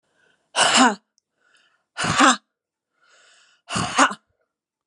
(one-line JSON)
{"exhalation_length": "4.9 s", "exhalation_amplitude": 30868, "exhalation_signal_mean_std_ratio": 0.36, "survey_phase": "beta (2021-08-13 to 2022-03-07)", "age": "45-64", "gender": "Female", "wearing_mask": "No", "symptom_new_continuous_cough": true, "symptom_runny_or_blocked_nose": true, "symptom_shortness_of_breath": true, "symptom_sore_throat": true, "symptom_fatigue": true, "symptom_headache": true, "symptom_other": true, "smoker_status": "Never smoked", "respiratory_condition_asthma": true, "respiratory_condition_other": false, "recruitment_source": "Test and Trace", "submission_delay": "2 days", "covid_test_result": "Positive", "covid_test_method": "LFT"}